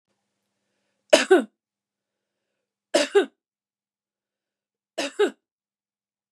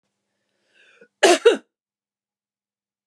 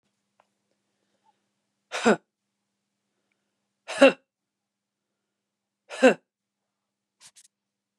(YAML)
three_cough_length: 6.3 s
three_cough_amplitude: 30516
three_cough_signal_mean_std_ratio: 0.24
cough_length: 3.1 s
cough_amplitude: 26644
cough_signal_mean_std_ratio: 0.23
exhalation_length: 8.0 s
exhalation_amplitude: 25447
exhalation_signal_mean_std_ratio: 0.17
survey_phase: beta (2021-08-13 to 2022-03-07)
age: 45-64
gender: Female
wearing_mask: 'No'
symptom_none: true
smoker_status: Never smoked
respiratory_condition_asthma: false
respiratory_condition_other: false
recruitment_source: REACT
submission_delay: 2 days
covid_test_result: Negative
covid_test_method: RT-qPCR
influenza_a_test_result: Negative
influenza_b_test_result: Negative